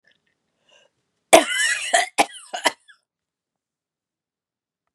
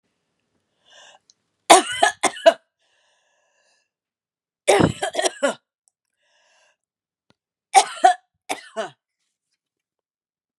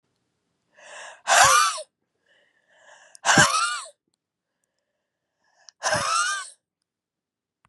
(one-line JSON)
{"cough_length": "4.9 s", "cough_amplitude": 32768, "cough_signal_mean_std_ratio": 0.27, "three_cough_length": "10.6 s", "three_cough_amplitude": 32768, "three_cough_signal_mean_std_ratio": 0.25, "exhalation_length": "7.7 s", "exhalation_amplitude": 25240, "exhalation_signal_mean_std_ratio": 0.35, "survey_phase": "beta (2021-08-13 to 2022-03-07)", "age": "45-64", "gender": "Female", "wearing_mask": "No", "symptom_runny_or_blocked_nose": true, "symptom_shortness_of_breath": true, "symptom_fatigue": true, "symptom_headache": true, "symptom_onset": "5 days", "smoker_status": "Never smoked", "respiratory_condition_asthma": true, "respiratory_condition_other": false, "recruitment_source": "Test and Trace", "submission_delay": "1 day", "covid_test_result": "Positive", "covid_test_method": "RT-qPCR", "covid_ct_value": 23.8, "covid_ct_gene": "N gene", "covid_ct_mean": 23.8, "covid_viral_load": "15000 copies/ml", "covid_viral_load_category": "Low viral load (10K-1M copies/ml)"}